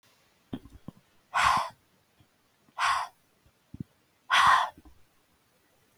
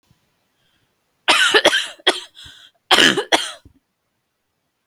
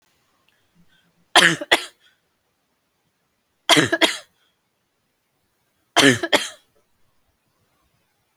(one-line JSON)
{"exhalation_length": "6.0 s", "exhalation_amplitude": 10761, "exhalation_signal_mean_std_ratio": 0.34, "cough_length": "4.9 s", "cough_amplitude": 32768, "cough_signal_mean_std_ratio": 0.36, "three_cough_length": "8.4 s", "three_cough_amplitude": 32768, "three_cough_signal_mean_std_ratio": 0.26, "survey_phase": "beta (2021-08-13 to 2022-03-07)", "age": "18-44", "gender": "Female", "wearing_mask": "No", "symptom_none": true, "smoker_status": "Never smoked", "respiratory_condition_asthma": false, "respiratory_condition_other": false, "recruitment_source": "REACT", "submission_delay": "1 day", "covid_test_result": "Negative", "covid_test_method": "RT-qPCR", "influenza_a_test_result": "Negative", "influenza_b_test_result": "Negative"}